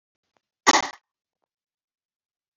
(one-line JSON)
{"cough_length": "2.6 s", "cough_amplitude": 29708, "cough_signal_mean_std_ratio": 0.18, "survey_phase": "beta (2021-08-13 to 2022-03-07)", "age": "65+", "gender": "Female", "wearing_mask": "No", "symptom_none": true, "smoker_status": "Ex-smoker", "respiratory_condition_asthma": false, "respiratory_condition_other": false, "recruitment_source": "REACT", "submission_delay": "7 days", "covid_test_result": "Negative", "covid_test_method": "RT-qPCR"}